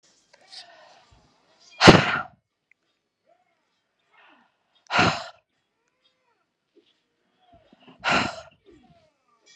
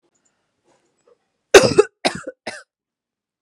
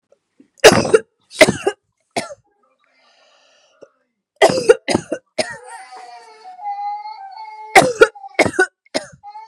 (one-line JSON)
{"exhalation_length": "9.6 s", "exhalation_amplitude": 32768, "exhalation_signal_mean_std_ratio": 0.21, "cough_length": "3.4 s", "cough_amplitude": 32768, "cough_signal_mean_std_ratio": 0.22, "three_cough_length": "9.5 s", "three_cough_amplitude": 32768, "three_cough_signal_mean_std_ratio": 0.33, "survey_phase": "beta (2021-08-13 to 2022-03-07)", "age": "18-44", "gender": "Female", "wearing_mask": "No", "symptom_none": true, "smoker_status": "Never smoked", "respiratory_condition_asthma": true, "respiratory_condition_other": false, "recruitment_source": "REACT", "submission_delay": "3 days", "covid_test_result": "Negative", "covid_test_method": "RT-qPCR", "influenza_a_test_result": "Negative", "influenza_b_test_result": "Negative"}